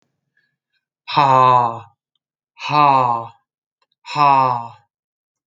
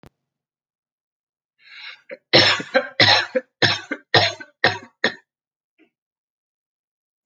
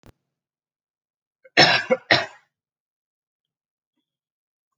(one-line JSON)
{"exhalation_length": "5.5 s", "exhalation_amplitude": 27727, "exhalation_signal_mean_std_ratio": 0.44, "three_cough_length": "7.3 s", "three_cough_amplitude": 31703, "three_cough_signal_mean_std_ratio": 0.32, "cough_length": "4.8 s", "cough_amplitude": 30595, "cough_signal_mean_std_ratio": 0.23, "survey_phase": "beta (2021-08-13 to 2022-03-07)", "age": "18-44", "gender": "Male", "wearing_mask": "No", "symptom_runny_or_blocked_nose": true, "smoker_status": "Never smoked", "respiratory_condition_asthma": false, "respiratory_condition_other": false, "recruitment_source": "REACT", "submission_delay": "1 day", "covid_test_result": "Negative", "covid_test_method": "RT-qPCR"}